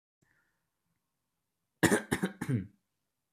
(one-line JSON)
{"cough_length": "3.3 s", "cough_amplitude": 11059, "cough_signal_mean_std_ratio": 0.29, "survey_phase": "beta (2021-08-13 to 2022-03-07)", "age": "18-44", "gender": "Male", "wearing_mask": "No", "symptom_none": true, "smoker_status": "Never smoked", "respiratory_condition_asthma": false, "respiratory_condition_other": false, "recruitment_source": "REACT", "submission_delay": "1 day", "covid_test_result": "Negative", "covid_test_method": "RT-qPCR"}